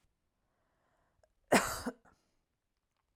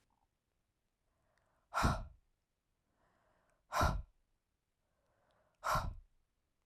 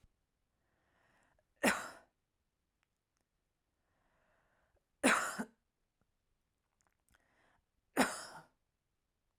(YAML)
cough_length: 3.2 s
cough_amplitude: 7436
cough_signal_mean_std_ratio: 0.21
exhalation_length: 6.7 s
exhalation_amplitude: 3548
exhalation_signal_mean_std_ratio: 0.29
three_cough_length: 9.4 s
three_cough_amplitude: 5661
three_cough_signal_mean_std_ratio: 0.21
survey_phase: alpha (2021-03-01 to 2021-08-12)
age: 18-44
gender: Female
wearing_mask: 'No'
symptom_fatigue: true
symptom_onset: 8 days
smoker_status: Never smoked
respiratory_condition_asthma: false
respiratory_condition_other: false
recruitment_source: REACT
submission_delay: 1 day
covid_test_result: Negative
covid_test_method: RT-qPCR